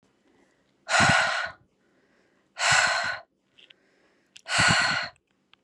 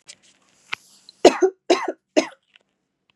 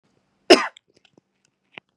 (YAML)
exhalation_length: 5.6 s
exhalation_amplitude: 14709
exhalation_signal_mean_std_ratio: 0.46
three_cough_length: 3.2 s
three_cough_amplitude: 32768
three_cough_signal_mean_std_ratio: 0.26
cough_length: 2.0 s
cough_amplitude: 32767
cough_signal_mean_std_ratio: 0.18
survey_phase: beta (2021-08-13 to 2022-03-07)
age: 18-44
gender: Female
wearing_mask: 'No'
symptom_runny_or_blocked_nose: true
smoker_status: Never smoked
respiratory_condition_asthma: false
respiratory_condition_other: false
recruitment_source: REACT
submission_delay: 2 days
covid_test_result: Negative
covid_test_method: RT-qPCR
influenza_a_test_result: Negative
influenza_b_test_result: Negative